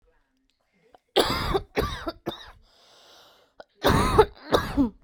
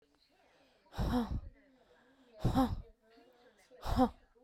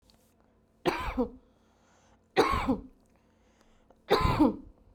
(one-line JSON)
{"cough_length": "5.0 s", "cough_amplitude": 24339, "cough_signal_mean_std_ratio": 0.42, "exhalation_length": "4.4 s", "exhalation_amplitude": 4665, "exhalation_signal_mean_std_ratio": 0.41, "three_cough_length": "4.9 s", "three_cough_amplitude": 9863, "three_cough_signal_mean_std_ratio": 0.4, "survey_phase": "beta (2021-08-13 to 2022-03-07)", "age": "18-44", "gender": "Female", "wearing_mask": "No", "symptom_none": true, "smoker_status": "Current smoker (1 to 10 cigarettes per day)", "respiratory_condition_asthma": false, "respiratory_condition_other": false, "recruitment_source": "REACT", "submission_delay": "2 days", "covid_test_result": "Negative", "covid_test_method": "RT-qPCR", "influenza_a_test_result": "Unknown/Void", "influenza_b_test_result": "Unknown/Void"}